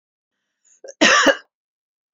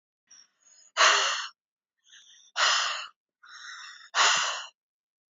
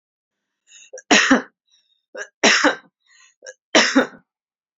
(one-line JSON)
{"cough_length": "2.1 s", "cough_amplitude": 28678, "cough_signal_mean_std_ratio": 0.33, "exhalation_length": "5.3 s", "exhalation_amplitude": 15249, "exhalation_signal_mean_std_ratio": 0.42, "three_cough_length": "4.8 s", "three_cough_amplitude": 32767, "three_cough_signal_mean_std_ratio": 0.35, "survey_phase": "beta (2021-08-13 to 2022-03-07)", "age": "45-64", "gender": "Female", "wearing_mask": "No", "symptom_none": true, "smoker_status": "Never smoked", "respiratory_condition_asthma": false, "respiratory_condition_other": false, "recruitment_source": "REACT", "submission_delay": "1 day", "covid_test_result": "Negative", "covid_test_method": "RT-qPCR", "influenza_a_test_result": "Unknown/Void", "influenza_b_test_result": "Unknown/Void"}